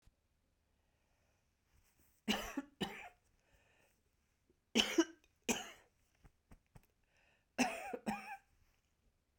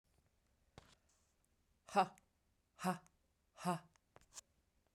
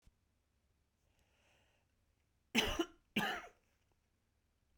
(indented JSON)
{
  "three_cough_length": "9.4 s",
  "three_cough_amplitude": 4482,
  "three_cough_signal_mean_std_ratio": 0.28,
  "exhalation_length": "4.9 s",
  "exhalation_amplitude": 2932,
  "exhalation_signal_mean_std_ratio": 0.24,
  "cough_length": "4.8 s",
  "cough_amplitude": 3989,
  "cough_signal_mean_std_ratio": 0.27,
  "survey_phase": "beta (2021-08-13 to 2022-03-07)",
  "age": "45-64",
  "gender": "Female",
  "wearing_mask": "No",
  "symptom_cough_any": true,
  "symptom_runny_or_blocked_nose": true,
  "symptom_sore_throat": true,
  "symptom_fatigue": true,
  "symptom_change_to_sense_of_smell_or_taste": true,
  "symptom_onset": "5 days",
  "smoker_status": "Never smoked",
  "respiratory_condition_asthma": false,
  "respiratory_condition_other": false,
  "recruitment_source": "Test and Trace",
  "submission_delay": "2 days",
  "covid_test_result": "Positive",
  "covid_test_method": "RT-qPCR",
  "covid_ct_value": 21.0,
  "covid_ct_gene": "N gene",
  "covid_ct_mean": 21.7,
  "covid_viral_load": "76000 copies/ml",
  "covid_viral_load_category": "Low viral load (10K-1M copies/ml)"
}